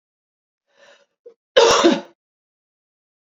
cough_length: 3.3 s
cough_amplitude: 27685
cough_signal_mean_std_ratio: 0.29
survey_phase: beta (2021-08-13 to 2022-03-07)
age: 18-44
gender: Female
wearing_mask: 'No'
symptom_none: true
smoker_status: Never smoked
respiratory_condition_asthma: false
respiratory_condition_other: false
recruitment_source: Test and Trace
submission_delay: 77 days
covid_test_result: Negative
covid_test_method: RT-qPCR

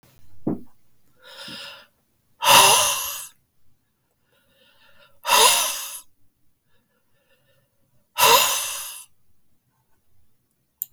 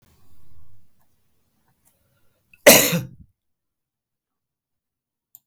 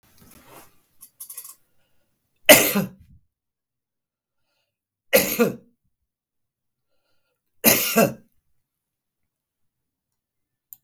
exhalation_length: 10.9 s
exhalation_amplitude: 32768
exhalation_signal_mean_std_ratio: 0.34
cough_length: 5.5 s
cough_amplitude: 32768
cough_signal_mean_std_ratio: 0.21
three_cough_length: 10.8 s
three_cough_amplitude: 32768
three_cough_signal_mean_std_ratio: 0.23
survey_phase: beta (2021-08-13 to 2022-03-07)
age: 65+
gender: Male
wearing_mask: 'No'
symptom_none: true
symptom_onset: 6 days
smoker_status: Never smoked
respiratory_condition_asthma: false
respiratory_condition_other: false
recruitment_source: REACT
submission_delay: 2 days
covid_test_result: Negative
covid_test_method: RT-qPCR
influenza_a_test_result: Negative
influenza_b_test_result: Negative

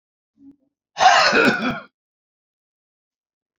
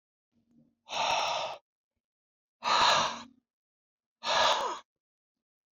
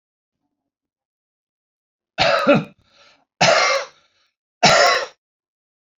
cough_length: 3.6 s
cough_amplitude: 27878
cough_signal_mean_std_ratio: 0.37
exhalation_length: 5.7 s
exhalation_amplitude: 8030
exhalation_signal_mean_std_ratio: 0.44
three_cough_length: 6.0 s
three_cough_amplitude: 31223
three_cough_signal_mean_std_ratio: 0.37
survey_phase: beta (2021-08-13 to 2022-03-07)
age: 45-64
gender: Male
wearing_mask: 'No'
symptom_none: true
smoker_status: Current smoker (11 or more cigarettes per day)
respiratory_condition_asthma: false
respiratory_condition_other: false
recruitment_source: REACT
submission_delay: 1 day
covid_test_result: Negative
covid_test_method: RT-qPCR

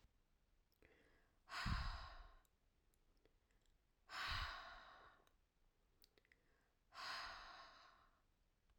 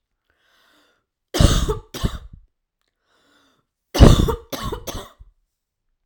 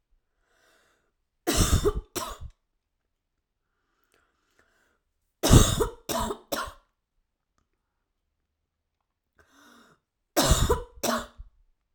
exhalation_length: 8.8 s
exhalation_amplitude: 765
exhalation_signal_mean_std_ratio: 0.42
cough_length: 6.1 s
cough_amplitude: 32768
cough_signal_mean_std_ratio: 0.29
three_cough_length: 11.9 s
three_cough_amplitude: 25834
three_cough_signal_mean_std_ratio: 0.3
survey_phase: beta (2021-08-13 to 2022-03-07)
age: 18-44
gender: Female
wearing_mask: 'No'
symptom_cough_any: true
symptom_new_continuous_cough: true
symptom_runny_or_blocked_nose: true
symptom_sore_throat: true
symptom_fatigue: true
smoker_status: Never smoked
respiratory_condition_asthma: false
respiratory_condition_other: true
recruitment_source: Test and Trace
submission_delay: -1 day
covid_test_result: Negative
covid_test_method: LFT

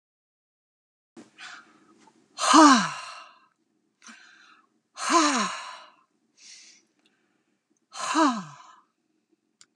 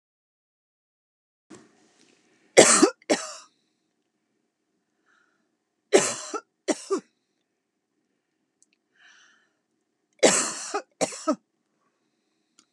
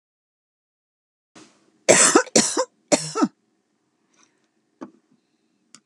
exhalation_length: 9.8 s
exhalation_amplitude: 24880
exhalation_signal_mean_std_ratio: 0.29
three_cough_length: 12.7 s
three_cough_amplitude: 32229
three_cough_signal_mean_std_ratio: 0.23
cough_length: 5.9 s
cough_amplitude: 32768
cough_signal_mean_std_ratio: 0.28
survey_phase: beta (2021-08-13 to 2022-03-07)
age: 65+
gender: Female
wearing_mask: 'No'
symptom_none: true
smoker_status: Ex-smoker
respiratory_condition_asthma: false
respiratory_condition_other: false
recruitment_source: REACT
submission_delay: 2 days
covid_test_result: Negative
covid_test_method: RT-qPCR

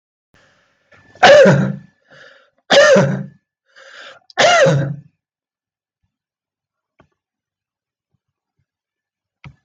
three_cough_length: 9.6 s
three_cough_amplitude: 32768
three_cough_signal_mean_std_ratio: 0.34
survey_phase: beta (2021-08-13 to 2022-03-07)
age: 65+
gender: Male
wearing_mask: 'No'
symptom_none: true
smoker_status: Ex-smoker
respiratory_condition_asthma: false
respiratory_condition_other: false
recruitment_source: REACT
submission_delay: 1 day
covid_test_result: Negative
covid_test_method: RT-qPCR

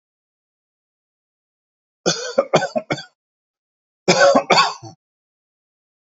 three_cough_length: 6.1 s
three_cough_amplitude: 29676
three_cough_signal_mean_std_ratio: 0.32
survey_phase: alpha (2021-03-01 to 2021-08-12)
age: 45-64
gender: Male
wearing_mask: 'No'
symptom_none: true
smoker_status: Ex-smoker
respiratory_condition_asthma: false
respiratory_condition_other: false
recruitment_source: REACT
submission_delay: 2 days
covid_test_result: Negative
covid_test_method: RT-qPCR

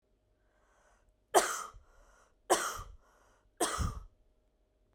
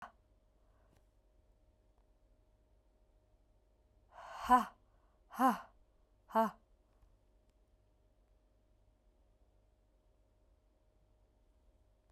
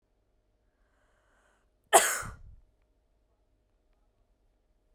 three_cough_length: 4.9 s
three_cough_amplitude: 10828
three_cough_signal_mean_std_ratio: 0.32
exhalation_length: 12.1 s
exhalation_amplitude: 5285
exhalation_signal_mean_std_ratio: 0.19
cough_length: 4.9 s
cough_amplitude: 21000
cough_signal_mean_std_ratio: 0.18
survey_phase: beta (2021-08-13 to 2022-03-07)
age: 18-44
gender: Female
wearing_mask: 'No'
symptom_sore_throat: true
symptom_fatigue: true
symptom_onset: 2 days
smoker_status: Ex-smoker
respiratory_condition_asthma: false
respiratory_condition_other: false
recruitment_source: Test and Trace
submission_delay: 2 days
covid_test_result: Positive
covid_test_method: RT-qPCR
covid_ct_value: 25.8
covid_ct_gene: ORF1ab gene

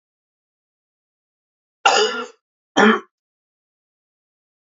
cough_length: 4.7 s
cough_amplitude: 32344
cough_signal_mean_std_ratio: 0.27
survey_phase: beta (2021-08-13 to 2022-03-07)
age: 18-44
gender: Male
wearing_mask: 'No'
symptom_cough_any: true
symptom_runny_or_blocked_nose: true
symptom_fatigue: true
symptom_onset: 3 days
smoker_status: Never smoked
respiratory_condition_asthma: false
respiratory_condition_other: false
recruitment_source: Test and Trace
submission_delay: 2 days
covid_test_result: Positive
covid_test_method: RT-qPCR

